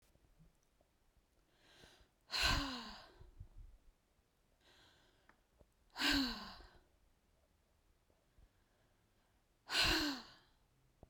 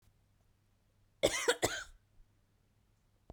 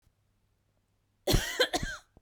{"exhalation_length": "11.1 s", "exhalation_amplitude": 2569, "exhalation_signal_mean_std_ratio": 0.33, "cough_length": "3.3 s", "cough_amplitude": 6013, "cough_signal_mean_std_ratio": 0.28, "three_cough_length": "2.2 s", "three_cough_amplitude": 7841, "three_cough_signal_mean_std_ratio": 0.37, "survey_phase": "beta (2021-08-13 to 2022-03-07)", "age": "18-44", "gender": "Female", "wearing_mask": "No", "symptom_none": true, "smoker_status": "Ex-smoker", "respiratory_condition_asthma": true, "respiratory_condition_other": false, "recruitment_source": "REACT", "submission_delay": "2 days", "covid_test_result": "Negative", "covid_test_method": "RT-qPCR", "influenza_a_test_result": "Unknown/Void", "influenza_b_test_result": "Unknown/Void"}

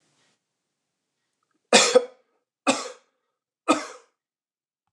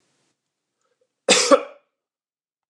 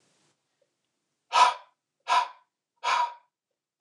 {"three_cough_length": "4.9 s", "three_cough_amplitude": 27464, "three_cough_signal_mean_std_ratio": 0.24, "cough_length": "2.7 s", "cough_amplitude": 28847, "cough_signal_mean_std_ratio": 0.25, "exhalation_length": "3.8 s", "exhalation_amplitude": 14194, "exhalation_signal_mean_std_ratio": 0.32, "survey_phase": "beta (2021-08-13 to 2022-03-07)", "age": "45-64", "gender": "Male", "wearing_mask": "No", "symptom_none": true, "smoker_status": "Never smoked", "respiratory_condition_asthma": false, "respiratory_condition_other": false, "recruitment_source": "REACT", "submission_delay": "4 days", "covid_test_result": "Negative", "covid_test_method": "RT-qPCR", "influenza_a_test_result": "Negative", "influenza_b_test_result": "Negative"}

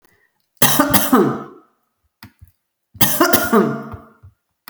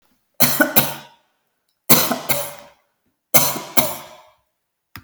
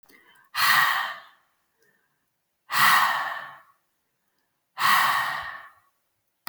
{"cough_length": "4.7 s", "cough_amplitude": 32768, "cough_signal_mean_std_ratio": 0.45, "three_cough_length": "5.0 s", "three_cough_amplitude": 32768, "three_cough_signal_mean_std_ratio": 0.38, "exhalation_length": "6.5 s", "exhalation_amplitude": 17780, "exhalation_signal_mean_std_ratio": 0.45, "survey_phase": "beta (2021-08-13 to 2022-03-07)", "age": "45-64", "gender": "Female", "wearing_mask": "No", "symptom_none": true, "smoker_status": "Never smoked", "respiratory_condition_asthma": false, "respiratory_condition_other": false, "recruitment_source": "REACT", "submission_delay": "4 days", "covid_test_result": "Negative", "covid_test_method": "RT-qPCR"}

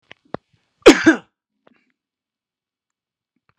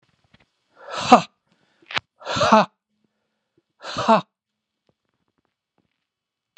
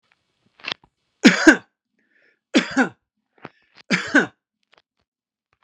{"cough_length": "3.6 s", "cough_amplitude": 32768, "cough_signal_mean_std_ratio": 0.19, "exhalation_length": "6.6 s", "exhalation_amplitude": 32768, "exhalation_signal_mean_std_ratio": 0.24, "three_cough_length": "5.6 s", "three_cough_amplitude": 32768, "three_cough_signal_mean_std_ratio": 0.26, "survey_phase": "beta (2021-08-13 to 2022-03-07)", "age": "45-64", "gender": "Male", "wearing_mask": "No", "symptom_none": true, "smoker_status": "Never smoked", "respiratory_condition_asthma": false, "respiratory_condition_other": false, "recruitment_source": "REACT", "submission_delay": "3 days", "covid_test_result": "Negative", "covid_test_method": "RT-qPCR"}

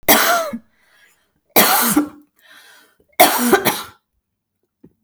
{"three_cough_length": "5.0 s", "three_cough_amplitude": 32768, "three_cough_signal_mean_std_ratio": 0.44, "survey_phase": "beta (2021-08-13 to 2022-03-07)", "age": "45-64", "gender": "Female", "wearing_mask": "No", "symptom_runny_or_blocked_nose": true, "symptom_sore_throat": true, "smoker_status": "Never smoked", "respiratory_condition_asthma": false, "respiratory_condition_other": false, "recruitment_source": "REACT", "submission_delay": "1 day", "covid_test_result": "Negative", "covid_test_method": "RT-qPCR", "influenza_a_test_result": "Negative", "influenza_b_test_result": "Negative"}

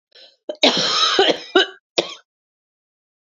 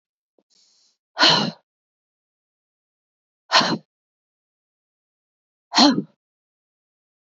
{"cough_length": "3.3 s", "cough_amplitude": 29988, "cough_signal_mean_std_ratio": 0.43, "exhalation_length": "7.3 s", "exhalation_amplitude": 28684, "exhalation_signal_mean_std_ratio": 0.25, "survey_phase": "beta (2021-08-13 to 2022-03-07)", "age": "45-64", "gender": "Female", "wearing_mask": "No", "symptom_cough_any": true, "symptom_runny_or_blocked_nose": true, "symptom_shortness_of_breath": true, "symptom_fatigue": true, "symptom_fever_high_temperature": true, "smoker_status": "Ex-smoker", "respiratory_condition_asthma": true, "respiratory_condition_other": false, "recruitment_source": "Test and Trace", "submission_delay": "2 days", "covid_test_result": "Positive", "covid_test_method": "RT-qPCR", "covid_ct_value": 29.3, "covid_ct_gene": "ORF1ab gene", "covid_ct_mean": 30.6, "covid_viral_load": "89 copies/ml", "covid_viral_load_category": "Minimal viral load (< 10K copies/ml)"}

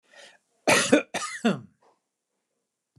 {"cough_length": "3.0 s", "cough_amplitude": 20379, "cough_signal_mean_std_ratio": 0.34, "survey_phase": "alpha (2021-03-01 to 2021-08-12)", "age": "65+", "gender": "Male", "wearing_mask": "No", "symptom_none": true, "smoker_status": "Never smoked", "respiratory_condition_asthma": false, "respiratory_condition_other": false, "recruitment_source": "REACT", "submission_delay": "3 days", "covid_test_result": "Negative", "covid_test_method": "RT-qPCR"}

